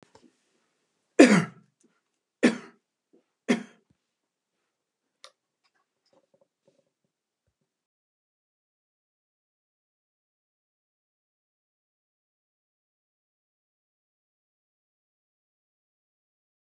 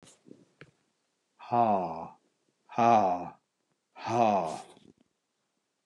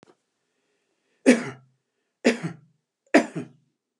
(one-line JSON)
{"cough_length": "16.6 s", "cough_amplitude": 27921, "cough_signal_mean_std_ratio": 0.12, "exhalation_length": "5.9 s", "exhalation_amplitude": 9856, "exhalation_signal_mean_std_ratio": 0.39, "three_cough_length": "4.0 s", "three_cough_amplitude": 27224, "three_cough_signal_mean_std_ratio": 0.25, "survey_phase": "beta (2021-08-13 to 2022-03-07)", "age": "65+", "gender": "Male", "wearing_mask": "No", "symptom_none": true, "smoker_status": "Never smoked", "respiratory_condition_asthma": false, "respiratory_condition_other": false, "recruitment_source": "REACT", "submission_delay": "2 days", "covid_test_result": "Negative", "covid_test_method": "RT-qPCR"}